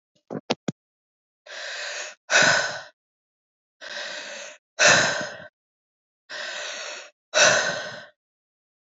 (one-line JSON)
{"exhalation_length": "9.0 s", "exhalation_amplitude": 26731, "exhalation_signal_mean_std_ratio": 0.4, "survey_phase": "beta (2021-08-13 to 2022-03-07)", "age": "18-44", "gender": "Female", "wearing_mask": "No", "symptom_cough_any": true, "symptom_runny_or_blocked_nose": true, "symptom_abdominal_pain": true, "symptom_fatigue": true, "smoker_status": "Current smoker (11 or more cigarettes per day)", "respiratory_condition_asthma": false, "respiratory_condition_other": false, "recruitment_source": "Test and Trace", "submission_delay": "1 day", "covid_test_result": "Positive", "covid_test_method": "ePCR"}